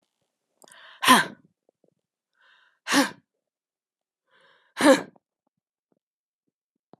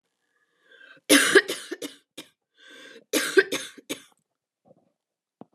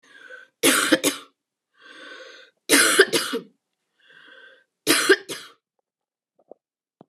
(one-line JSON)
{"exhalation_length": "7.0 s", "exhalation_amplitude": 24764, "exhalation_signal_mean_std_ratio": 0.22, "cough_length": "5.5 s", "cough_amplitude": 23939, "cough_signal_mean_std_ratio": 0.28, "three_cough_length": "7.1 s", "three_cough_amplitude": 30804, "three_cough_signal_mean_std_ratio": 0.35, "survey_phase": "beta (2021-08-13 to 2022-03-07)", "age": "45-64", "gender": "Female", "wearing_mask": "No", "symptom_cough_any": true, "symptom_runny_or_blocked_nose": true, "symptom_shortness_of_breath": true, "symptom_sore_throat": true, "symptom_abdominal_pain": true, "symptom_fatigue": true, "symptom_change_to_sense_of_smell_or_taste": true, "symptom_other": true, "smoker_status": "Never smoked", "respiratory_condition_asthma": false, "respiratory_condition_other": false, "recruitment_source": "Test and Trace", "submission_delay": "2 days", "covid_test_result": "Positive", "covid_test_method": "LFT"}